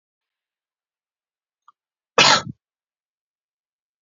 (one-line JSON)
{"cough_length": "4.0 s", "cough_amplitude": 30090, "cough_signal_mean_std_ratio": 0.19, "survey_phase": "beta (2021-08-13 to 2022-03-07)", "age": "45-64", "gender": "Male", "wearing_mask": "No", "symptom_none": true, "symptom_onset": "2 days", "smoker_status": "Never smoked", "respiratory_condition_asthma": false, "respiratory_condition_other": false, "recruitment_source": "REACT", "submission_delay": "0 days", "covid_test_result": "Negative", "covid_test_method": "RT-qPCR"}